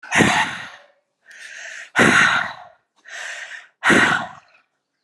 {"exhalation_length": "5.0 s", "exhalation_amplitude": 29656, "exhalation_signal_mean_std_ratio": 0.48, "survey_phase": "beta (2021-08-13 to 2022-03-07)", "age": "18-44", "gender": "Female", "wearing_mask": "No", "symptom_none": true, "smoker_status": "Ex-smoker", "respiratory_condition_asthma": false, "respiratory_condition_other": false, "recruitment_source": "Test and Trace", "submission_delay": "2 days", "covid_test_result": "Positive", "covid_test_method": "RT-qPCR", "covid_ct_value": 30.7, "covid_ct_gene": "N gene"}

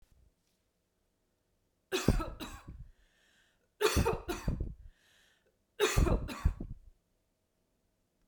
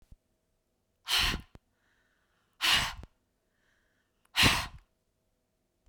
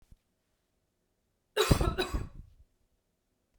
{"three_cough_length": "8.3 s", "three_cough_amplitude": 8136, "three_cough_signal_mean_std_ratio": 0.37, "exhalation_length": "5.9 s", "exhalation_amplitude": 11165, "exhalation_signal_mean_std_ratio": 0.31, "cough_length": "3.6 s", "cough_amplitude": 14735, "cough_signal_mean_std_ratio": 0.3, "survey_phase": "beta (2021-08-13 to 2022-03-07)", "age": "45-64", "gender": "Female", "wearing_mask": "No", "symptom_none": true, "smoker_status": "Never smoked", "respiratory_condition_asthma": false, "respiratory_condition_other": false, "recruitment_source": "REACT", "submission_delay": "2 days", "covid_test_result": "Negative", "covid_test_method": "RT-qPCR", "influenza_a_test_result": "Negative", "influenza_b_test_result": "Negative"}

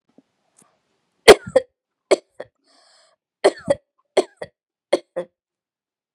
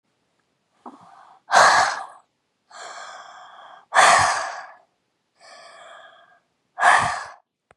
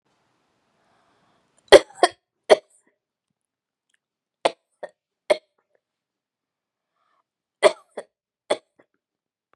{"cough_length": "6.1 s", "cough_amplitude": 32768, "cough_signal_mean_std_ratio": 0.18, "exhalation_length": "7.8 s", "exhalation_amplitude": 28999, "exhalation_signal_mean_std_ratio": 0.36, "three_cough_length": "9.6 s", "three_cough_amplitude": 32768, "three_cough_signal_mean_std_ratio": 0.14, "survey_phase": "beta (2021-08-13 to 2022-03-07)", "age": "18-44", "gender": "Female", "wearing_mask": "No", "symptom_runny_or_blocked_nose": true, "smoker_status": "Never smoked", "respiratory_condition_asthma": false, "respiratory_condition_other": true, "recruitment_source": "REACT", "submission_delay": "1 day", "covid_test_result": "Negative", "covid_test_method": "RT-qPCR"}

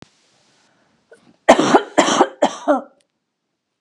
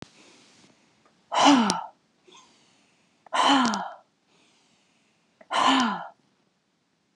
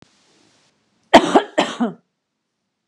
{"three_cough_length": "3.8 s", "three_cough_amplitude": 32768, "three_cough_signal_mean_std_ratio": 0.35, "exhalation_length": "7.2 s", "exhalation_amplitude": 25077, "exhalation_signal_mean_std_ratio": 0.37, "cough_length": "2.9 s", "cough_amplitude": 32768, "cough_signal_mean_std_ratio": 0.27, "survey_phase": "beta (2021-08-13 to 2022-03-07)", "age": "45-64", "gender": "Female", "wearing_mask": "No", "symptom_none": true, "smoker_status": "Never smoked", "respiratory_condition_asthma": false, "respiratory_condition_other": false, "recruitment_source": "REACT", "submission_delay": "3 days", "covid_test_result": "Negative", "covid_test_method": "RT-qPCR", "influenza_a_test_result": "Negative", "influenza_b_test_result": "Negative"}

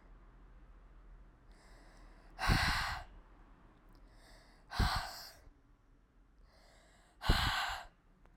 {"exhalation_length": "8.4 s", "exhalation_amplitude": 5462, "exhalation_signal_mean_std_ratio": 0.4, "survey_phase": "alpha (2021-03-01 to 2021-08-12)", "age": "18-44", "gender": "Female", "wearing_mask": "No", "symptom_cough_any": true, "symptom_abdominal_pain": true, "symptom_fatigue": true, "symptom_fever_high_temperature": true, "symptom_headache": true, "smoker_status": "Never smoked", "respiratory_condition_asthma": false, "respiratory_condition_other": false, "recruitment_source": "Test and Trace", "submission_delay": "2 days", "covid_test_result": "Positive", "covid_test_method": "RT-qPCR", "covid_ct_value": 23.8, "covid_ct_gene": "ORF1ab gene", "covid_ct_mean": 24.4, "covid_viral_load": "9800 copies/ml", "covid_viral_load_category": "Minimal viral load (< 10K copies/ml)"}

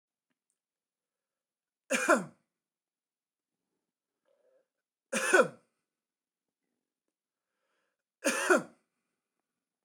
{"three_cough_length": "9.8 s", "three_cough_amplitude": 10898, "three_cough_signal_mean_std_ratio": 0.22, "survey_phase": "beta (2021-08-13 to 2022-03-07)", "age": "45-64", "gender": "Male", "wearing_mask": "No", "symptom_cough_any": true, "symptom_runny_or_blocked_nose": true, "symptom_change_to_sense_of_smell_or_taste": true, "symptom_loss_of_taste": true, "smoker_status": "Never smoked", "respiratory_condition_asthma": false, "respiratory_condition_other": false, "recruitment_source": "Test and Trace", "submission_delay": "2 days", "covid_test_result": "Positive", "covid_test_method": "RT-qPCR", "covid_ct_value": 15.5, "covid_ct_gene": "ORF1ab gene", "covid_ct_mean": 17.1, "covid_viral_load": "2500000 copies/ml", "covid_viral_load_category": "High viral load (>1M copies/ml)"}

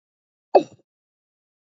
{"cough_length": "1.8 s", "cough_amplitude": 26414, "cough_signal_mean_std_ratio": 0.15, "survey_phase": "alpha (2021-03-01 to 2021-08-12)", "age": "45-64", "gender": "Female", "wearing_mask": "No", "symptom_cough_any": true, "symptom_headache": true, "symptom_onset": "5 days", "smoker_status": "Never smoked", "respiratory_condition_asthma": false, "respiratory_condition_other": false, "recruitment_source": "REACT", "submission_delay": "2 days", "covid_test_result": "Negative", "covid_test_method": "RT-qPCR"}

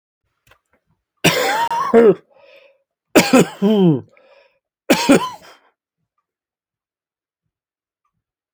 {"three_cough_length": "8.5 s", "three_cough_amplitude": 31230, "three_cough_signal_mean_std_ratio": 0.36, "survey_phase": "alpha (2021-03-01 to 2021-08-12)", "age": "65+", "gender": "Male", "wearing_mask": "No", "symptom_none": true, "smoker_status": "Never smoked", "respiratory_condition_asthma": false, "respiratory_condition_other": false, "recruitment_source": "REACT", "submission_delay": "2 days", "covid_test_result": "Negative", "covid_test_method": "RT-qPCR"}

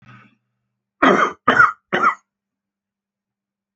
{"cough_length": "3.8 s", "cough_amplitude": 28817, "cough_signal_mean_std_ratio": 0.34, "survey_phase": "alpha (2021-03-01 to 2021-08-12)", "age": "65+", "gender": "Male", "wearing_mask": "No", "symptom_none": true, "smoker_status": "Current smoker (11 or more cigarettes per day)", "respiratory_condition_asthma": false, "respiratory_condition_other": false, "recruitment_source": "REACT", "submission_delay": "1 day", "covid_test_result": "Negative", "covid_test_method": "RT-qPCR"}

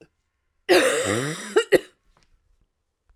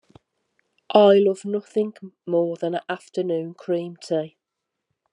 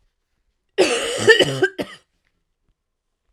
{"cough_length": "3.2 s", "cough_amplitude": 24743, "cough_signal_mean_std_ratio": 0.39, "exhalation_length": "5.1 s", "exhalation_amplitude": 25017, "exhalation_signal_mean_std_ratio": 0.47, "three_cough_length": "3.3 s", "three_cough_amplitude": 32768, "three_cough_signal_mean_std_ratio": 0.37, "survey_phase": "alpha (2021-03-01 to 2021-08-12)", "age": "45-64", "gender": "Female", "wearing_mask": "No", "symptom_cough_any": true, "symptom_shortness_of_breath": true, "symptom_abdominal_pain": true, "symptom_fatigue": true, "symptom_fever_high_temperature": true, "symptom_headache": true, "symptom_change_to_sense_of_smell_or_taste": true, "symptom_loss_of_taste": true, "symptom_onset": "9 days", "smoker_status": "Never smoked", "respiratory_condition_asthma": true, "respiratory_condition_other": false, "recruitment_source": "Test and Trace", "submission_delay": "1 day", "covid_test_result": "Positive", "covid_test_method": "RT-qPCR", "covid_ct_value": 18.8, "covid_ct_gene": "ORF1ab gene", "covid_ct_mean": 18.9, "covid_viral_load": "630000 copies/ml", "covid_viral_load_category": "Low viral load (10K-1M copies/ml)"}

